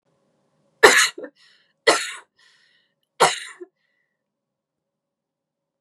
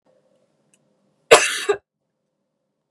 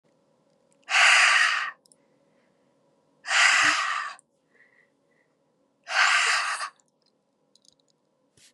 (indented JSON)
{
  "three_cough_length": "5.8 s",
  "three_cough_amplitude": 32768,
  "three_cough_signal_mean_std_ratio": 0.24,
  "cough_length": "2.9 s",
  "cough_amplitude": 32768,
  "cough_signal_mean_std_ratio": 0.22,
  "exhalation_length": "8.5 s",
  "exhalation_amplitude": 17467,
  "exhalation_signal_mean_std_ratio": 0.42,
  "survey_phase": "beta (2021-08-13 to 2022-03-07)",
  "age": "18-44",
  "gender": "Female",
  "wearing_mask": "No",
  "symptom_runny_or_blocked_nose": true,
  "smoker_status": "Never smoked",
  "respiratory_condition_asthma": false,
  "respiratory_condition_other": false,
  "recruitment_source": "Test and Trace",
  "submission_delay": "2 days",
  "covid_test_result": "Positive",
  "covid_test_method": "RT-qPCR"
}